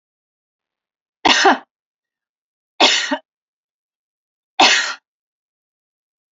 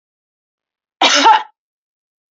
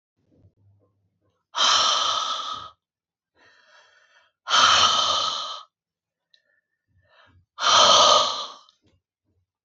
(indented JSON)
{
  "three_cough_length": "6.3 s",
  "three_cough_amplitude": 30223,
  "three_cough_signal_mean_std_ratio": 0.3,
  "cough_length": "2.3 s",
  "cough_amplitude": 31094,
  "cough_signal_mean_std_ratio": 0.34,
  "exhalation_length": "9.6 s",
  "exhalation_amplitude": 24445,
  "exhalation_signal_mean_std_ratio": 0.43,
  "survey_phase": "beta (2021-08-13 to 2022-03-07)",
  "age": "45-64",
  "gender": "Female",
  "wearing_mask": "No",
  "symptom_none": true,
  "smoker_status": "Never smoked",
  "respiratory_condition_asthma": false,
  "respiratory_condition_other": false,
  "recruitment_source": "Test and Trace",
  "submission_delay": "3 days",
  "covid_test_result": "Negative",
  "covid_test_method": "RT-qPCR"
}